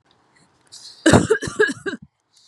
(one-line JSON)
{"cough_length": "2.5 s", "cough_amplitude": 32768, "cough_signal_mean_std_ratio": 0.36, "survey_phase": "beta (2021-08-13 to 2022-03-07)", "age": "45-64", "gender": "Female", "wearing_mask": "No", "symptom_none": true, "smoker_status": "Ex-smoker", "respiratory_condition_asthma": false, "respiratory_condition_other": false, "recruitment_source": "REACT", "submission_delay": "1 day", "covid_test_result": "Negative", "covid_test_method": "RT-qPCR"}